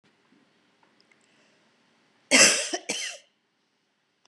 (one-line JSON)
{"cough_length": "4.3 s", "cough_amplitude": 25786, "cough_signal_mean_std_ratio": 0.26, "survey_phase": "beta (2021-08-13 to 2022-03-07)", "age": "45-64", "gender": "Female", "wearing_mask": "No", "symptom_shortness_of_breath": true, "symptom_fatigue": true, "symptom_onset": "12 days", "smoker_status": "Never smoked", "respiratory_condition_asthma": false, "respiratory_condition_other": false, "recruitment_source": "REACT", "submission_delay": "2 days", "covid_test_result": "Negative", "covid_test_method": "RT-qPCR", "influenza_a_test_result": "Negative", "influenza_b_test_result": "Negative"}